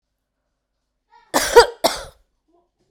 {
  "cough_length": "2.9 s",
  "cough_amplitude": 32768,
  "cough_signal_mean_std_ratio": 0.25,
  "survey_phase": "beta (2021-08-13 to 2022-03-07)",
  "age": "18-44",
  "gender": "Female",
  "wearing_mask": "Yes",
  "symptom_runny_or_blocked_nose": true,
  "symptom_sore_throat": true,
  "symptom_diarrhoea": true,
  "symptom_fever_high_temperature": true,
  "symptom_headache": true,
  "symptom_onset": "2 days",
  "smoker_status": "Current smoker (11 or more cigarettes per day)",
  "respiratory_condition_asthma": false,
  "respiratory_condition_other": false,
  "recruitment_source": "Test and Trace",
  "submission_delay": "2 days",
  "covid_test_result": "Positive",
  "covid_test_method": "ePCR"
}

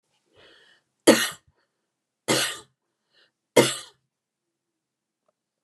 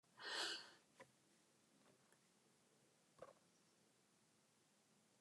{
  "three_cough_length": "5.6 s",
  "three_cough_amplitude": 28439,
  "three_cough_signal_mean_std_ratio": 0.23,
  "cough_length": "5.2 s",
  "cough_amplitude": 639,
  "cough_signal_mean_std_ratio": 0.33,
  "survey_phase": "alpha (2021-03-01 to 2021-08-12)",
  "age": "65+",
  "gender": "Female",
  "wearing_mask": "No",
  "symptom_none": true,
  "smoker_status": "Ex-smoker",
  "respiratory_condition_asthma": false,
  "respiratory_condition_other": false,
  "recruitment_source": "REACT",
  "submission_delay": "1 day",
  "covid_test_result": "Negative",
  "covid_test_method": "RT-qPCR"
}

